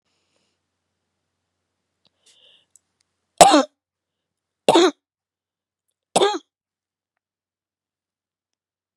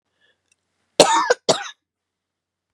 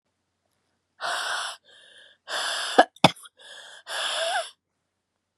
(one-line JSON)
{"three_cough_length": "9.0 s", "three_cough_amplitude": 32768, "three_cough_signal_mean_std_ratio": 0.2, "cough_length": "2.7 s", "cough_amplitude": 32768, "cough_signal_mean_std_ratio": 0.29, "exhalation_length": "5.4 s", "exhalation_amplitude": 32768, "exhalation_signal_mean_std_ratio": 0.34, "survey_phase": "beta (2021-08-13 to 2022-03-07)", "age": "45-64", "gender": "Female", "wearing_mask": "No", "symptom_cough_any": true, "symptom_fatigue": true, "symptom_other": true, "symptom_onset": "3 days", "smoker_status": "Never smoked", "respiratory_condition_asthma": false, "respiratory_condition_other": false, "recruitment_source": "Test and Trace", "submission_delay": "2 days", "covid_test_result": "Positive", "covid_test_method": "RT-qPCR", "covid_ct_value": 25.7, "covid_ct_gene": "ORF1ab gene", "covid_ct_mean": 26.1, "covid_viral_load": "2800 copies/ml", "covid_viral_load_category": "Minimal viral load (< 10K copies/ml)"}